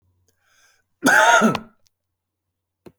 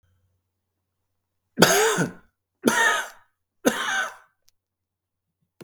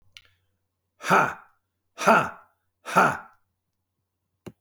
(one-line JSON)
{"cough_length": "3.0 s", "cough_amplitude": 27435, "cough_signal_mean_std_ratio": 0.35, "three_cough_length": "5.6 s", "three_cough_amplitude": 32766, "three_cough_signal_mean_std_ratio": 0.37, "exhalation_length": "4.6 s", "exhalation_amplitude": 21179, "exhalation_signal_mean_std_ratio": 0.32, "survey_phase": "beta (2021-08-13 to 2022-03-07)", "age": "45-64", "gender": "Male", "wearing_mask": "No", "symptom_none": true, "smoker_status": "Ex-smoker", "respiratory_condition_asthma": false, "respiratory_condition_other": false, "recruitment_source": "REACT", "submission_delay": "1 day", "covid_test_result": "Negative", "covid_test_method": "RT-qPCR", "influenza_a_test_result": "Unknown/Void", "influenza_b_test_result": "Unknown/Void"}